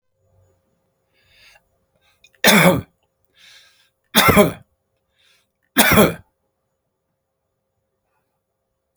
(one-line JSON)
{"three_cough_length": "9.0 s", "three_cough_amplitude": 32768, "three_cough_signal_mean_std_ratio": 0.28, "survey_phase": "beta (2021-08-13 to 2022-03-07)", "age": "65+", "gender": "Male", "wearing_mask": "No", "symptom_none": true, "smoker_status": "Ex-smoker", "respiratory_condition_asthma": false, "respiratory_condition_other": false, "recruitment_source": "REACT", "submission_delay": "1 day", "covid_test_result": "Negative", "covid_test_method": "RT-qPCR"}